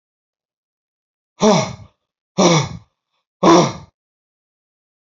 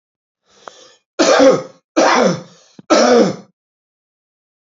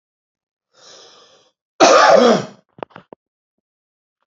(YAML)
exhalation_length: 5.0 s
exhalation_amplitude: 30212
exhalation_signal_mean_std_ratio: 0.33
three_cough_length: 4.6 s
three_cough_amplitude: 31786
three_cough_signal_mean_std_ratio: 0.45
cough_length: 4.3 s
cough_amplitude: 29698
cough_signal_mean_std_ratio: 0.32
survey_phase: alpha (2021-03-01 to 2021-08-12)
age: 45-64
gender: Male
wearing_mask: 'No'
symptom_none: true
symptom_onset: 12 days
smoker_status: Ex-smoker
respiratory_condition_asthma: false
respiratory_condition_other: false
recruitment_source: REACT
submission_delay: 2 days
covid_test_result: Negative
covid_test_method: RT-qPCR